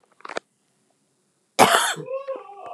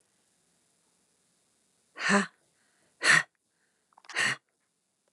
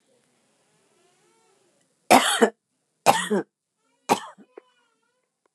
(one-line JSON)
{"cough_length": "2.7 s", "cough_amplitude": 29204, "cough_signal_mean_std_ratio": 0.35, "exhalation_length": "5.1 s", "exhalation_amplitude": 11363, "exhalation_signal_mean_std_ratio": 0.27, "three_cough_length": "5.5 s", "three_cough_amplitude": 28548, "three_cough_signal_mean_std_ratio": 0.26, "survey_phase": "alpha (2021-03-01 to 2021-08-12)", "age": "45-64", "gender": "Female", "wearing_mask": "No", "symptom_none": true, "smoker_status": "Never smoked", "respiratory_condition_asthma": false, "respiratory_condition_other": false, "recruitment_source": "REACT", "submission_delay": "6 days", "covid_test_result": "Negative", "covid_test_method": "RT-qPCR"}